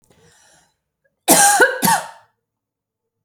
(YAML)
cough_length: 3.2 s
cough_amplitude: 32768
cough_signal_mean_std_ratio: 0.37
survey_phase: alpha (2021-03-01 to 2021-08-12)
age: 18-44
gender: Female
wearing_mask: 'No'
symptom_none: true
smoker_status: Never smoked
respiratory_condition_asthma: false
respiratory_condition_other: false
recruitment_source: REACT
submission_delay: 2 days
covid_test_result: Negative
covid_test_method: RT-qPCR